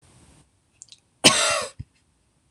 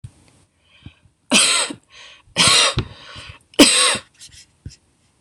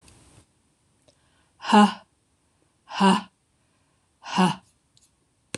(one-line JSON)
{"cough_length": "2.5 s", "cough_amplitude": 26028, "cough_signal_mean_std_ratio": 0.3, "three_cough_length": "5.2 s", "three_cough_amplitude": 26028, "three_cough_signal_mean_std_ratio": 0.4, "exhalation_length": "5.6 s", "exhalation_amplitude": 21355, "exhalation_signal_mean_std_ratio": 0.28, "survey_phase": "beta (2021-08-13 to 2022-03-07)", "age": "45-64", "gender": "Female", "wearing_mask": "No", "symptom_none": true, "smoker_status": "Never smoked", "respiratory_condition_asthma": false, "respiratory_condition_other": false, "recruitment_source": "REACT", "submission_delay": "2 days", "covid_test_result": "Negative", "covid_test_method": "RT-qPCR", "influenza_a_test_result": "Negative", "influenza_b_test_result": "Negative"}